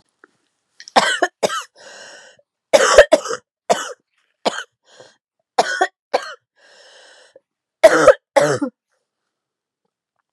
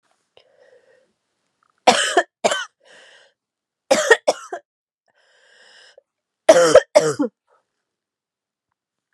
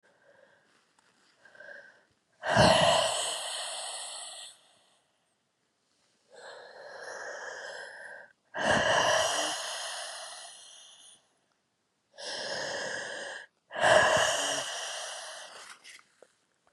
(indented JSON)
{
  "cough_length": "10.3 s",
  "cough_amplitude": 32768,
  "cough_signal_mean_std_ratio": 0.31,
  "three_cough_length": "9.1 s",
  "three_cough_amplitude": 32768,
  "three_cough_signal_mean_std_ratio": 0.28,
  "exhalation_length": "16.7 s",
  "exhalation_amplitude": 12233,
  "exhalation_signal_mean_std_ratio": 0.46,
  "survey_phase": "beta (2021-08-13 to 2022-03-07)",
  "age": "18-44",
  "gender": "Female",
  "wearing_mask": "No",
  "symptom_new_continuous_cough": true,
  "symptom_runny_or_blocked_nose": true,
  "symptom_sore_throat": true,
  "symptom_fatigue": true,
  "symptom_fever_high_temperature": true,
  "symptom_headache": true,
  "symptom_change_to_sense_of_smell_or_taste": true,
  "symptom_onset": "3 days",
  "smoker_status": "Never smoked",
  "respiratory_condition_asthma": false,
  "respiratory_condition_other": false,
  "recruitment_source": "Test and Trace",
  "submission_delay": "1 day",
  "covid_test_result": "Positive",
  "covid_test_method": "RT-qPCR",
  "covid_ct_value": 19.3,
  "covid_ct_gene": "ORF1ab gene",
  "covid_ct_mean": 19.6,
  "covid_viral_load": "380000 copies/ml",
  "covid_viral_load_category": "Low viral load (10K-1M copies/ml)"
}